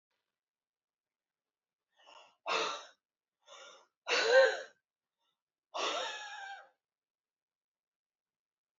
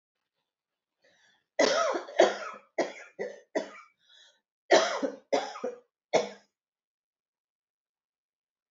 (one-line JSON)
{"exhalation_length": "8.8 s", "exhalation_amplitude": 6665, "exhalation_signal_mean_std_ratio": 0.28, "cough_length": "8.7 s", "cough_amplitude": 15660, "cough_signal_mean_std_ratio": 0.33, "survey_phase": "alpha (2021-03-01 to 2021-08-12)", "age": "65+", "gender": "Female", "wearing_mask": "No", "symptom_none": true, "smoker_status": "Ex-smoker", "respiratory_condition_asthma": false, "respiratory_condition_other": false, "recruitment_source": "REACT", "submission_delay": "1 day", "covid_test_result": "Negative", "covid_test_method": "RT-qPCR"}